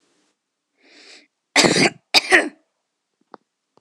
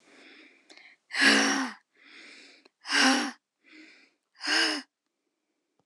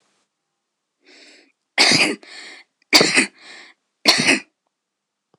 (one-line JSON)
{"cough_length": "3.8 s", "cough_amplitude": 26028, "cough_signal_mean_std_ratio": 0.3, "exhalation_length": "5.9 s", "exhalation_amplitude": 12942, "exhalation_signal_mean_std_ratio": 0.39, "three_cough_length": "5.4 s", "three_cough_amplitude": 26028, "three_cough_signal_mean_std_ratio": 0.35, "survey_phase": "beta (2021-08-13 to 2022-03-07)", "age": "18-44", "gender": "Female", "wearing_mask": "No", "symptom_none": true, "smoker_status": "Never smoked", "respiratory_condition_asthma": false, "respiratory_condition_other": false, "recruitment_source": "REACT", "submission_delay": "9 days", "covid_test_result": "Negative", "covid_test_method": "RT-qPCR"}